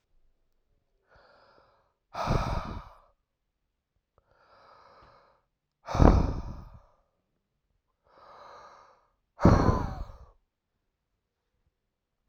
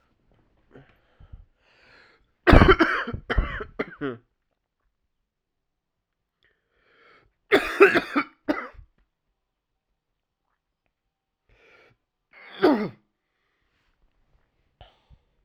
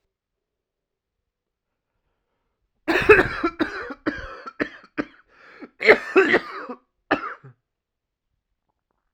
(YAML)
exhalation_length: 12.3 s
exhalation_amplitude: 31906
exhalation_signal_mean_std_ratio: 0.25
three_cough_length: 15.4 s
three_cough_amplitude: 32768
three_cough_signal_mean_std_ratio: 0.24
cough_length: 9.1 s
cough_amplitude: 32768
cough_signal_mean_std_ratio: 0.29
survey_phase: alpha (2021-03-01 to 2021-08-12)
age: 18-44
gender: Male
wearing_mask: 'No'
symptom_cough_any: true
symptom_fatigue: true
symptom_fever_high_temperature: true
symptom_onset: 3 days
smoker_status: Ex-smoker
respiratory_condition_asthma: true
respiratory_condition_other: false
recruitment_source: Test and Trace
submission_delay: 1 day
covid_test_result: Positive
covid_test_method: RT-qPCR
covid_ct_value: 15.6
covid_ct_gene: ORF1ab gene
covid_ct_mean: 15.9
covid_viral_load: 6200000 copies/ml
covid_viral_load_category: High viral load (>1M copies/ml)